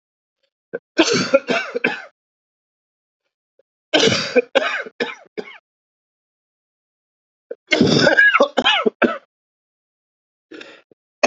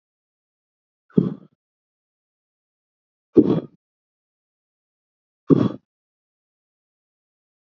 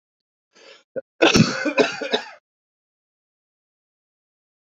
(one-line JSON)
{"three_cough_length": "11.3 s", "three_cough_amplitude": 32767, "three_cough_signal_mean_std_ratio": 0.38, "exhalation_length": "7.7 s", "exhalation_amplitude": 31688, "exhalation_signal_mean_std_ratio": 0.18, "cough_length": "4.8 s", "cough_amplitude": 27167, "cough_signal_mean_std_ratio": 0.3, "survey_phase": "beta (2021-08-13 to 2022-03-07)", "age": "45-64", "gender": "Male", "wearing_mask": "No", "symptom_cough_any": true, "symptom_new_continuous_cough": true, "symptom_sore_throat": true, "symptom_fatigue": true, "symptom_headache": true, "symptom_change_to_sense_of_smell_or_taste": true, "symptom_loss_of_taste": true, "symptom_onset": "3 days", "smoker_status": "Ex-smoker", "respiratory_condition_asthma": false, "respiratory_condition_other": false, "recruitment_source": "Test and Trace", "submission_delay": "2 days", "covid_test_result": "Positive", "covid_test_method": "ePCR"}